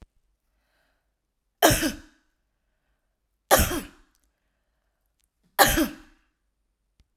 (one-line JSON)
{"three_cough_length": "7.2 s", "three_cough_amplitude": 29109, "three_cough_signal_mean_std_ratio": 0.26, "survey_phase": "alpha (2021-03-01 to 2021-08-12)", "age": "45-64", "gender": "Female", "wearing_mask": "No", "symptom_none": true, "smoker_status": "Never smoked", "respiratory_condition_asthma": false, "respiratory_condition_other": false, "recruitment_source": "REACT", "submission_delay": "10 days", "covid_test_result": "Negative", "covid_test_method": "RT-qPCR"}